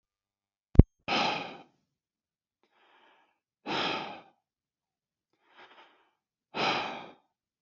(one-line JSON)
{"exhalation_length": "7.6 s", "exhalation_amplitude": 32768, "exhalation_signal_mean_std_ratio": 0.21, "survey_phase": "beta (2021-08-13 to 2022-03-07)", "age": "45-64", "gender": "Male", "wearing_mask": "No", "symptom_none": true, "smoker_status": "Never smoked", "respiratory_condition_asthma": true, "respiratory_condition_other": false, "recruitment_source": "REACT", "submission_delay": "1 day", "covid_test_result": "Negative", "covid_test_method": "RT-qPCR"}